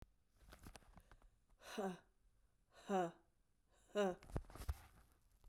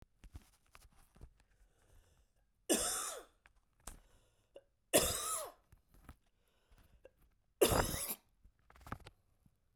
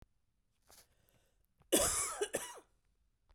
{
  "exhalation_length": "5.5 s",
  "exhalation_amplitude": 1476,
  "exhalation_signal_mean_std_ratio": 0.37,
  "three_cough_length": "9.8 s",
  "three_cough_amplitude": 5817,
  "three_cough_signal_mean_std_ratio": 0.31,
  "cough_length": "3.3 s",
  "cough_amplitude": 4388,
  "cough_signal_mean_std_ratio": 0.34,
  "survey_phase": "beta (2021-08-13 to 2022-03-07)",
  "age": "45-64",
  "gender": "Female",
  "wearing_mask": "No",
  "symptom_cough_any": true,
  "symptom_new_continuous_cough": true,
  "symptom_runny_or_blocked_nose": true,
  "symptom_sore_throat": true,
  "symptom_fatigue": true,
  "symptom_fever_high_temperature": true,
  "symptom_headache": true,
  "symptom_change_to_sense_of_smell_or_taste": true,
  "symptom_onset": "4 days",
  "smoker_status": "Never smoked",
  "respiratory_condition_asthma": false,
  "respiratory_condition_other": false,
  "recruitment_source": "Test and Trace",
  "submission_delay": "1 day",
  "covid_test_result": "Negative",
  "covid_test_method": "RT-qPCR"
}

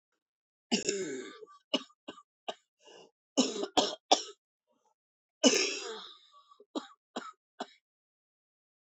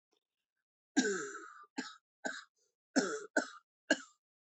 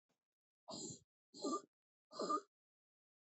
{
  "three_cough_length": "8.9 s",
  "three_cough_amplitude": 18366,
  "three_cough_signal_mean_std_ratio": 0.31,
  "cough_length": "4.5 s",
  "cough_amplitude": 5732,
  "cough_signal_mean_std_ratio": 0.34,
  "exhalation_length": "3.2 s",
  "exhalation_amplitude": 1111,
  "exhalation_signal_mean_std_ratio": 0.36,
  "survey_phase": "beta (2021-08-13 to 2022-03-07)",
  "age": "45-64",
  "gender": "Female",
  "wearing_mask": "No",
  "symptom_new_continuous_cough": true,
  "symptom_runny_or_blocked_nose": true,
  "symptom_shortness_of_breath": true,
  "symptom_sore_throat": true,
  "symptom_fatigue": true,
  "symptom_fever_high_temperature": true,
  "symptom_headache": true,
  "symptom_change_to_sense_of_smell_or_taste": true,
  "symptom_other": true,
  "smoker_status": "Ex-smoker",
  "respiratory_condition_asthma": false,
  "respiratory_condition_other": false,
  "recruitment_source": "Test and Trace",
  "submission_delay": "1 day",
  "covid_test_result": "Positive",
  "covid_test_method": "LFT"
}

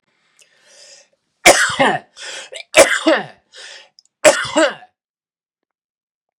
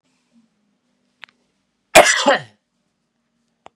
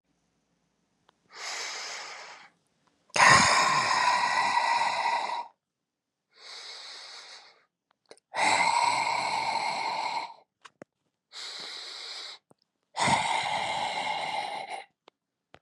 {
  "three_cough_length": "6.4 s",
  "three_cough_amplitude": 32768,
  "three_cough_signal_mean_std_ratio": 0.34,
  "cough_length": "3.8 s",
  "cough_amplitude": 32768,
  "cough_signal_mean_std_ratio": 0.24,
  "exhalation_length": "15.6 s",
  "exhalation_amplitude": 17013,
  "exhalation_signal_mean_std_ratio": 0.54,
  "survey_phase": "beta (2021-08-13 to 2022-03-07)",
  "age": "45-64",
  "gender": "Male",
  "wearing_mask": "No",
  "symptom_none": true,
  "smoker_status": "Never smoked",
  "respiratory_condition_asthma": false,
  "respiratory_condition_other": false,
  "recruitment_source": "REACT",
  "submission_delay": "2 days",
  "covid_test_result": "Negative",
  "covid_test_method": "RT-qPCR",
  "influenza_a_test_result": "Negative",
  "influenza_b_test_result": "Negative"
}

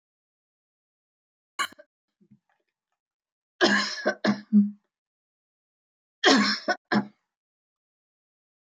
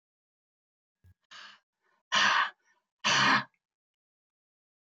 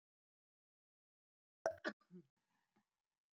{
  "three_cough_length": "8.6 s",
  "three_cough_amplitude": 18600,
  "three_cough_signal_mean_std_ratio": 0.3,
  "exhalation_length": "4.9 s",
  "exhalation_amplitude": 7337,
  "exhalation_signal_mean_std_ratio": 0.33,
  "cough_length": "3.3 s",
  "cough_amplitude": 1932,
  "cough_signal_mean_std_ratio": 0.17,
  "survey_phase": "beta (2021-08-13 to 2022-03-07)",
  "age": "65+",
  "gender": "Female",
  "wearing_mask": "No",
  "symptom_none": true,
  "smoker_status": "Never smoked",
  "respiratory_condition_asthma": true,
  "respiratory_condition_other": false,
  "recruitment_source": "REACT",
  "submission_delay": "1 day",
  "covid_test_result": "Negative",
  "covid_test_method": "RT-qPCR"
}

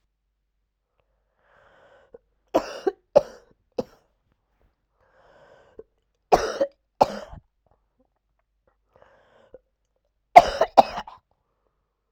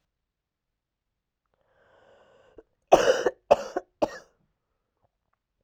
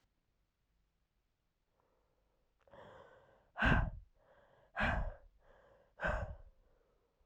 {
  "three_cough_length": "12.1 s",
  "three_cough_amplitude": 32768,
  "three_cough_signal_mean_std_ratio": 0.17,
  "cough_length": "5.6 s",
  "cough_amplitude": 27959,
  "cough_signal_mean_std_ratio": 0.21,
  "exhalation_length": "7.3 s",
  "exhalation_amplitude": 4216,
  "exhalation_signal_mean_std_ratio": 0.31,
  "survey_phase": "alpha (2021-03-01 to 2021-08-12)",
  "age": "18-44",
  "gender": "Female",
  "wearing_mask": "No",
  "symptom_cough_any": true,
  "symptom_fatigue": true,
  "symptom_fever_high_temperature": true,
  "symptom_headache": true,
  "symptom_onset": "4 days",
  "smoker_status": "Never smoked",
  "respiratory_condition_asthma": false,
  "respiratory_condition_other": false,
  "recruitment_source": "Test and Trace",
  "submission_delay": "1 day",
  "covid_test_result": "Positive",
  "covid_test_method": "RT-qPCR"
}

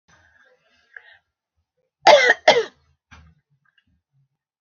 {
  "cough_length": "4.6 s",
  "cough_amplitude": 31842,
  "cough_signal_mean_std_ratio": 0.24,
  "survey_phase": "beta (2021-08-13 to 2022-03-07)",
  "age": "65+",
  "gender": "Female",
  "wearing_mask": "No",
  "symptom_none": true,
  "smoker_status": "Ex-smoker",
  "respiratory_condition_asthma": false,
  "respiratory_condition_other": false,
  "recruitment_source": "REACT",
  "submission_delay": "1 day",
  "covid_test_result": "Negative",
  "covid_test_method": "RT-qPCR"
}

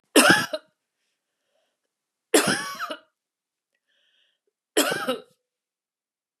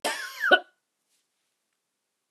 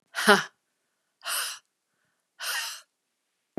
{
  "three_cough_length": "6.4 s",
  "three_cough_amplitude": 28556,
  "three_cough_signal_mean_std_ratio": 0.3,
  "cough_length": "2.3 s",
  "cough_amplitude": 20079,
  "cough_signal_mean_std_ratio": 0.27,
  "exhalation_length": "3.6 s",
  "exhalation_amplitude": 26517,
  "exhalation_signal_mean_std_ratio": 0.3,
  "survey_phase": "beta (2021-08-13 to 2022-03-07)",
  "age": "65+",
  "gender": "Female",
  "wearing_mask": "No",
  "symptom_none": true,
  "smoker_status": "Ex-smoker",
  "respiratory_condition_asthma": false,
  "respiratory_condition_other": false,
  "recruitment_source": "REACT",
  "submission_delay": "1 day",
  "covid_test_result": "Negative",
  "covid_test_method": "RT-qPCR",
  "influenza_a_test_result": "Unknown/Void",
  "influenza_b_test_result": "Unknown/Void"
}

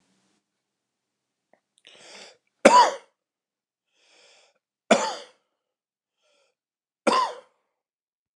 {
  "three_cough_length": "8.4 s",
  "three_cough_amplitude": 29204,
  "three_cough_signal_mean_std_ratio": 0.22,
  "survey_phase": "beta (2021-08-13 to 2022-03-07)",
  "age": "45-64",
  "gender": "Male",
  "wearing_mask": "No",
  "symptom_cough_any": true,
  "symptom_shortness_of_breath": true,
  "symptom_onset": "9 days",
  "smoker_status": "Never smoked",
  "respiratory_condition_asthma": true,
  "respiratory_condition_other": false,
  "recruitment_source": "REACT",
  "submission_delay": "1 day",
  "covid_test_result": "Negative",
  "covid_test_method": "RT-qPCR"
}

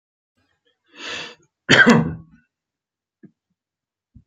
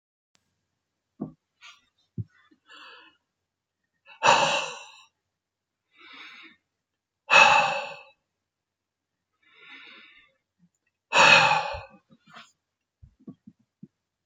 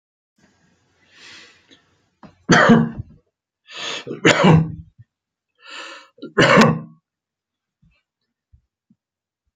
{
  "cough_length": "4.3 s",
  "cough_amplitude": 30993,
  "cough_signal_mean_std_ratio": 0.27,
  "exhalation_length": "14.3 s",
  "exhalation_amplitude": 25005,
  "exhalation_signal_mean_std_ratio": 0.26,
  "three_cough_length": "9.6 s",
  "three_cough_amplitude": 32767,
  "three_cough_signal_mean_std_ratio": 0.32,
  "survey_phase": "alpha (2021-03-01 to 2021-08-12)",
  "age": "65+",
  "gender": "Male",
  "wearing_mask": "No",
  "symptom_none": true,
  "symptom_onset": "12 days",
  "smoker_status": "Ex-smoker",
  "respiratory_condition_asthma": false,
  "respiratory_condition_other": false,
  "recruitment_source": "REACT",
  "submission_delay": "2 days",
  "covid_test_result": "Negative",
  "covid_test_method": "RT-qPCR"
}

